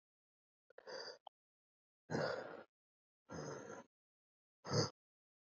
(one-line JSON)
{"exhalation_length": "5.5 s", "exhalation_amplitude": 2299, "exhalation_signal_mean_std_ratio": 0.34, "survey_phase": "beta (2021-08-13 to 2022-03-07)", "age": "18-44", "gender": "Male", "wearing_mask": "No", "symptom_cough_any": true, "symptom_fatigue": true, "symptom_headache": true, "symptom_change_to_sense_of_smell_or_taste": true, "smoker_status": "Current smoker (1 to 10 cigarettes per day)", "respiratory_condition_asthma": false, "respiratory_condition_other": false, "recruitment_source": "Test and Trace", "submission_delay": "3 days", "covid_test_result": "Positive", "covid_test_method": "RT-qPCR", "covid_ct_value": 18.3, "covid_ct_gene": "ORF1ab gene", "covid_ct_mean": 18.9, "covid_viral_load": "630000 copies/ml", "covid_viral_load_category": "Low viral load (10K-1M copies/ml)"}